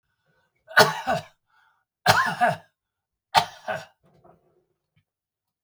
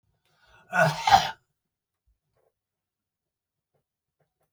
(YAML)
three_cough_length: 5.6 s
three_cough_amplitude: 31318
three_cough_signal_mean_std_ratio: 0.3
cough_length: 4.5 s
cough_amplitude: 22032
cough_signal_mean_std_ratio: 0.23
survey_phase: beta (2021-08-13 to 2022-03-07)
age: 65+
gender: Male
wearing_mask: 'No'
symptom_none: true
symptom_onset: 10 days
smoker_status: Ex-smoker
respiratory_condition_asthma: false
respiratory_condition_other: false
recruitment_source: REACT
submission_delay: 4 days
covid_test_result: Negative
covid_test_method: RT-qPCR
influenza_a_test_result: Negative
influenza_b_test_result: Negative